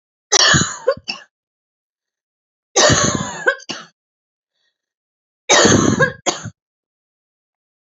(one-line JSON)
{"three_cough_length": "7.9 s", "three_cough_amplitude": 32768, "three_cough_signal_mean_std_ratio": 0.39, "survey_phase": "alpha (2021-03-01 to 2021-08-12)", "age": "45-64", "gender": "Female", "wearing_mask": "No", "symptom_none": true, "smoker_status": "Never smoked", "respiratory_condition_asthma": true, "respiratory_condition_other": true, "recruitment_source": "REACT", "submission_delay": "9 days", "covid_test_result": "Negative", "covid_test_method": "RT-qPCR"}